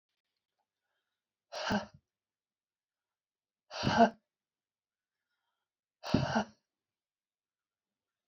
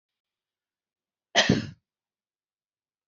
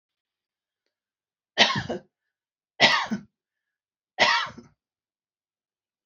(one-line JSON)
{"exhalation_length": "8.3 s", "exhalation_amplitude": 10102, "exhalation_signal_mean_std_ratio": 0.23, "cough_length": "3.1 s", "cough_amplitude": 18544, "cough_signal_mean_std_ratio": 0.22, "three_cough_length": "6.1 s", "three_cough_amplitude": 27777, "three_cough_signal_mean_std_ratio": 0.28, "survey_phase": "beta (2021-08-13 to 2022-03-07)", "age": "65+", "gender": "Female", "wearing_mask": "No", "symptom_none": true, "smoker_status": "Ex-smoker", "respiratory_condition_asthma": false, "respiratory_condition_other": false, "recruitment_source": "REACT", "submission_delay": "3 days", "covid_test_result": "Negative", "covid_test_method": "RT-qPCR"}